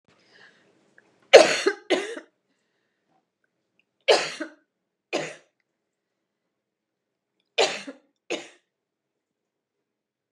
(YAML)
three_cough_length: 10.3 s
three_cough_amplitude: 32768
three_cough_signal_mean_std_ratio: 0.2
survey_phase: beta (2021-08-13 to 2022-03-07)
age: 65+
gender: Female
wearing_mask: 'No'
symptom_none: true
smoker_status: Never smoked
respiratory_condition_asthma: false
respiratory_condition_other: false
recruitment_source: REACT
submission_delay: 2 days
covid_test_result: Negative
covid_test_method: RT-qPCR
influenza_a_test_result: Negative
influenza_b_test_result: Negative